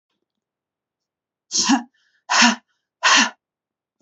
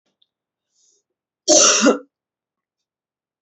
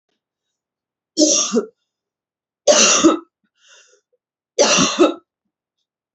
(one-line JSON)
{"exhalation_length": "4.0 s", "exhalation_amplitude": 29102, "exhalation_signal_mean_std_ratio": 0.35, "cough_length": "3.4 s", "cough_amplitude": 28654, "cough_signal_mean_std_ratio": 0.3, "three_cough_length": "6.1 s", "three_cough_amplitude": 31860, "three_cough_signal_mean_std_ratio": 0.39, "survey_phase": "beta (2021-08-13 to 2022-03-07)", "age": "18-44", "gender": "Female", "wearing_mask": "No", "symptom_cough_any": true, "symptom_runny_or_blocked_nose": true, "symptom_sore_throat": true, "symptom_fatigue": true, "symptom_headache": true, "symptom_onset": "4 days", "smoker_status": "Ex-smoker", "respiratory_condition_asthma": false, "respiratory_condition_other": false, "recruitment_source": "REACT", "submission_delay": "3 days", "covid_test_result": "Negative", "covid_test_method": "RT-qPCR", "influenza_a_test_result": "Negative", "influenza_b_test_result": "Negative"}